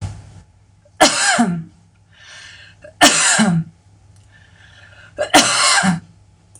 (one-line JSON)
{"three_cough_length": "6.6 s", "three_cough_amplitude": 26028, "three_cough_signal_mean_std_ratio": 0.48, "survey_phase": "beta (2021-08-13 to 2022-03-07)", "age": "45-64", "gender": "Female", "wearing_mask": "No", "symptom_none": true, "smoker_status": "Never smoked", "respiratory_condition_asthma": false, "respiratory_condition_other": false, "recruitment_source": "REACT", "submission_delay": "3 days", "covid_test_result": "Negative", "covid_test_method": "RT-qPCR", "influenza_a_test_result": "Negative", "influenza_b_test_result": "Negative"}